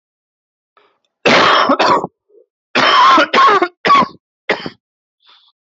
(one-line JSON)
{"cough_length": "5.7 s", "cough_amplitude": 30614, "cough_signal_mean_std_ratio": 0.51, "survey_phase": "alpha (2021-03-01 to 2021-08-12)", "age": "18-44", "gender": "Male", "wearing_mask": "No", "symptom_cough_any": true, "symptom_shortness_of_breath": true, "symptom_diarrhoea": true, "symptom_fatigue": true, "symptom_headache": true, "symptom_change_to_sense_of_smell_or_taste": true, "symptom_loss_of_taste": true, "smoker_status": "Current smoker (e-cigarettes or vapes only)", "respiratory_condition_asthma": false, "respiratory_condition_other": false, "recruitment_source": "Test and Trace", "submission_delay": "1 day", "covid_test_result": "Positive", "covid_test_method": "LFT"}